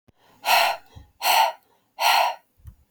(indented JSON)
{
  "exhalation_length": "2.9 s",
  "exhalation_amplitude": 19144,
  "exhalation_signal_mean_std_ratio": 0.49,
  "survey_phase": "beta (2021-08-13 to 2022-03-07)",
  "age": "45-64",
  "gender": "Female",
  "wearing_mask": "No",
  "symptom_none": true,
  "smoker_status": "Ex-smoker",
  "respiratory_condition_asthma": false,
  "respiratory_condition_other": false,
  "recruitment_source": "REACT",
  "submission_delay": "1 day",
  "covid_test_result": "Negative",
  "covid_test_method": "RT-qPCR",
  "influenza_a_test_result": "Negative",
  "influenza_b_test_result": "Negative"
}